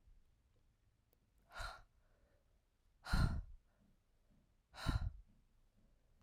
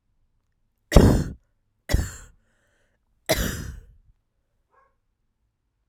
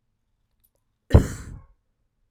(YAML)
exhalation_length: 6.2 s
exhalation_amplitude: 2586
exhalation_signal_mean_std_ratio: 0.3
three_cough_length: 5.9 s
three_cough_amplitude: 32768
three_cough_signal_mean_std_ratio: 0.25
cough_length: 2.3 s
cough_amplitude: 30563
cough_signal_mean_std_ratio: 0.19
survey_phase: beta (2021-08-13 to 2022-03-07)
age: 18-44
gender: Female
wearing_mask: 'Yes'
symptom_runny_or_blocked_nose: true
symptom_fatigue: true
symptom_headache: true
smoker_status: Never smoked
respiratory_condition_asthma: true
respiratory_condition_other: false
recruitment_source: Test and Trace
submission_delay: 0 days
covid_test_result: Negative
covid_test_method: RT-qPCR